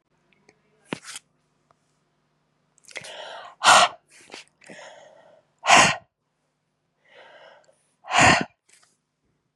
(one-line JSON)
{"exhalation_length": "9.6 s", "exhalation_amplitude": 29599, "exhalation_signal_mean_std_ratio": 0.26, "survey_phase": "beta (2021-08-13 to 2022-03-07)", "age": "45-64", "gender": "Female", "wearing_mask": "No", "symptom_cough_any": true, "symptom_runny_or_blocked_nose": true, "symptom_fatigue": true, "symptom_onset": "4 days", "smoker_status": "Never smoked", "respiratory_condition_asthma": false, "respiratory_condition_other": false, "recruitment_source": "Test and Trace", "submission_delay": "2 days", "covid_test_result": "Positive", "covid_test_method": "RT-qPCR", "covid_ct_value": 18.3, "covid_ct_gene": "N gene"}